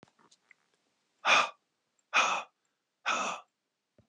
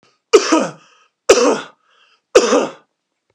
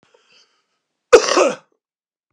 {"exhalation_length": "4.1 s", "exhalation_amplitude": 8576, "exhalation_signal_mean_std_ratio": 0.34, "three_cough_length": "3.3 s", "three_cough_amplitude": 32768, "three_cough_signal_mean_std_ratio": 0.4, "cough_length": "2.3 s", "cough_amplitude": 32768, "cough_signal_mean_std_ratio": 0.28, "survey_phase": "beta (2021-08-13 to 2022-03-07)", "age": "65+", "gender": "Male", "wearing_mask": "No", "symptom_cough_any": true, "symptom_other": true, "smoker_status": "Never smoked", "respiratory_condition_asthma": true, "respiratory_condition_other": false, "recruitment_source": "Test and Trace", "submission_delay": "3 days", "covid_test_result": "Negative", "covid_test_method": "RT-qPCR"}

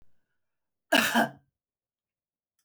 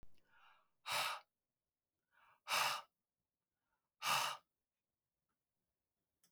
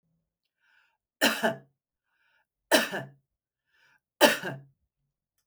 {"cough_length": "2.6 s", "cough_amplitude": 13397, "cough_signal_mean_std_ratio": 0.28, "exhalation_length": "6.3 s", "exhalation_amplitude": 2076, "exhalation_signal_mean_std_ratio": 0.33, "three_cough_length": "5.5 s", "three_cough_amplitude": 24046, "three_cough_signal_mean_std_ratio": 0.27, "survey_phase": "beta (2021-08-13 to 2022-03-07)", "age": "65+", "gender": "Female", "wearing_mask": "No", "symptom_none": true, "smoker_status": "Never smoked", "respiratory_condition_asthma": false, "respiratory_condition_other": false, "recruitment_source": "REACT", "submission_delay": "5 days", "covid_test_result": "Negative", "covid_test_method": "RT-qPCR", "influenza_a_test_result": "Negative", "influenza_b_test_result": "Negative"}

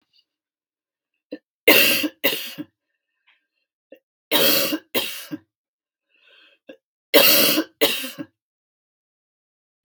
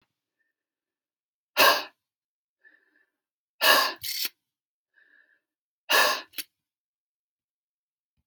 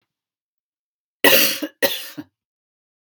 {"three_cough_length": "9.8 s", "three_cough_amplitude": 32768, "three_cough_signal_mean_std_ratio": 0.35, "exhalation_length": "8.3 s", "exhalation_amplitude": 18597, "exhalation_signal_mean_std_ratio": 0.27, "cough_length": "3.1 s", "cough_amplitude": 32768, "cough_signal_mean_std_ratio": 0.31, "survey_phase": "beta (2021-08-13 to 2022-03-07)", "age": "65+", "gender": "Female", "wearing_mask": "No", "symptom_none": true, "smoker_status": "Never smoked", "respiratory_condition_asthma": false, "respiratory_condition_other": false, "recruitment_source": "REACT", "submission_delay": "1 day", "covid_test_result": "Negative", "covid_test_method": "RT-qPCR", "influenza_a_test_result": "Negative", "influenza_b_test_result": "Negative"}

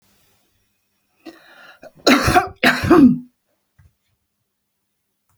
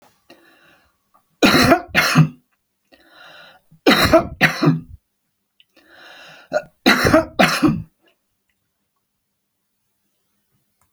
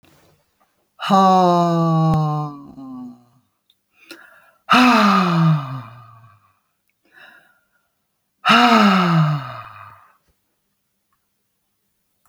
{"cough_length": "5.4 s", "cough_amplitude": 31230, "cough_signal_mean_std_ratio": 0.32, "three_cough_length": "10.9 s", "three_cough_amplitude": 32768, "three_cough_signal_mean_std_ratio": 0.36, "exhalation_length": "12.3 s", "exhalation_amplitude": 32768, "exhalation_signal_mean_std_ratio": 0.48, "survey_phase": "beta (2021-08-13 to 2022-03-07)", "age": "65+", "gender": "Female", "wearing_mask": "No", "symptom_none": true, "smoker_status": "Never smoked", "respiratory_condition_asthma": false, "respiratory_condition_other": false, "recruitment_source": "REACT", "submission_delay": "1 day", "covid_test_result": "Negative", "covid_test_method": "RT-qPCR"}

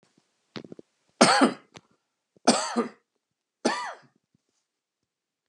{"three_cough_length": "5.5 s", "three_cough_amplitude": 29417, "three_cough_signal_mean_std_ratio": 0.29, "survey_phase": "beta (2021-08-13 to 2022-03-07)", "age": "45-64", "gender": "Male", "wearing_mask": "No", "symptom_sore_throat": true, "smoker_status": "Never smoked", "respiratory_condition_asthma": false, "respiratory_condition_other": true, "recruitment_source": "REACT", "submission_delay": "2 days", "covid_test_result": "Negative", "covid_test_method": "RT-qPCR", "influenza_a_test_result": "Negative", "influenza_b_test_result": "Negative"}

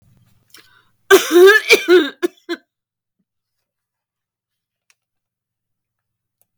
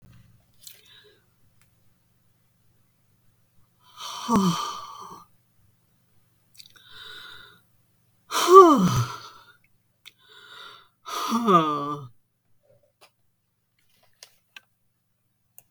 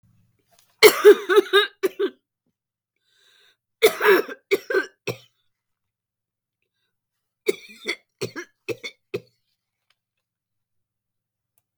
{"cough_length": "6.6 s", "cough_amplitude": 32768, "cough_signal_mean_std_ratio": 0.29, "exhalation_length": "15.7 s", "exhalation_amplitude": 32766, "exhalation_signal_mean_std_ratio": 0.26, "three_cough_length": "11.8 s", "three_cough_amplitude": 32768, "three_cough_signal_mean_std_ratio": 0.25, "survey_phase": "beta (2021-08-13 to 2022-03-07)", "age": "65+", "gender": "Female", "wearing_mask": "No", "symptom_none": true, "smoker_status": "Never smoked", "respiratory_condition_asthma": false, "respiratory_condition_other": false, "recruitment_source": "REACT", "submission_delay": "2 days", "covid_test_result": "Negative", "covid_test_method": "RT-qPCR", "influenza_a_test_result": "Negative", "influenza_b_test_result": "Negative"}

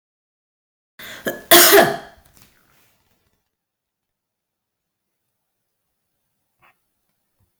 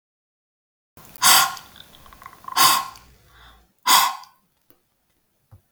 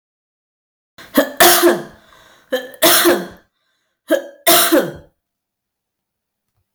{"cough_length": "7.6 s", "cough_amplitude": 32768, "cough_signal_mean_std_ratio": 0.21, "exhalation_length": "5.7 s", "exhalation_amplitude": 32533, "exhalation_signal_mean_std_ratio": 0.32, "three_cough_length": "6.7 s", "three_cough_amplitude": 32767, "three_cough_signal_mean_std_ratio": 0.4, "survey_phase": "beta (2021-08-13 to 2022-03-07)", "age": "45-64", "gender": "Female", "wearing_mask": "No", "symptom_none": true, "smoker_status": "Ex-smoker", "respiratory_condition_asthma": false, "respiratory_condition_other": false, "recruitment_source": "REACT", "submission_delay": "1 day", "covid_test_result": "Negative", "covid_test_method": "RT-qPCR"}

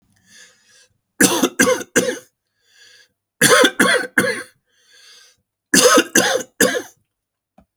{"three_cough_length": "7.8 s", "three_cough_amplitude": 32768, "three_cough_signal_mean_std_ratio": 0.42, "survey_phase": "alpha (2021-03-01 to 2021-08-12)", "age": "65+", "gender": "Male", "wearing_mask": "No", "symptom_none": true, "smoker_status": "Never smoked", "respiratory_condition_asthma": false, "respiratory_condition_other": false, "recruitment_source": "REACT", "submission_delay": "3 days", "covid_test_result": "Negative", "covid_test_method": "RT-qPCR"}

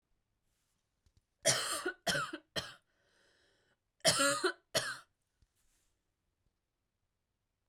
{"three_cough_length": "7.7 s", "three_cough_amplitude": 6575, "three_cough_signal_mean_std_ratio": 0.33, "survey_phase": "beta (2021-08-13 to 2022-03-07)", "age": "18-44", "gender": "Female", "wearing_mask": "No", "symptom_sore_throat": true, "smoker_status": "Current smoker (e-cigarettes or vapes only)", "respiratory_condition_asthma": false, "respiratory_condition_other": false, "recruitment_source": "REACT", "submission_delay": "1 day", "covid_test_result": "Positive", "covid_test_method": "RT-qPCR", "covid_ct_value": 36.0, "covid_ct_gene": "N gene", "influenza_a_test_result": "Negative", "influenza_b_test_result": "Negative"}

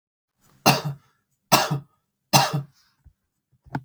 {"three_cough_length": "3.8 s", "three_cough_amplitude": 27384, "three_cough_signal_mean_std_ratio": 0.33, "survey_phase": "beta (2021-08-13 to 2022-03-07)", "age": "45-64", "gender": "Male", "wearing_mask": "No", "symptom_cough_any": true, "symptom_runny_or_blocked_nose": true, "smoker_status": "Never smoked", "respiratory_condition_asthma": false, "respiratory_condition_other": false, "recruitment_source": "REACT", "submission_delay": "1 day", "covid_test_result": "Negative", "covid_test_method": "RT-qPCR", "influenza_a_test_result": "Unknown/Void", "influenza_b_test_result": "Unknown/Void"}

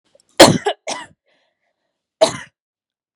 {"cough_length": "3.2 s", "cough_amplitude": 32768, "cough_signal_mean_std_ratio": 0.25, "survey_phase": "beta (2021-08-13 to 2022-03-07)", "age": "18-44", "gender": "Female", "wearing_mask": "No", "symptom_cough_any": true, "symptom_onset": "8 days", "smoker_status": "Never smoked", "respiratory_condition_asthma": false, "respiratory_condition_other": false, "recruitment_source": "REACT", "submission_delay": "2 days", "covid_test_result": "Negative", "covid_test_method": "RT-qPCR", "influenza_a_test_result": "Unknown/Void", "influenza_b_test_result": "Unknown/Void"}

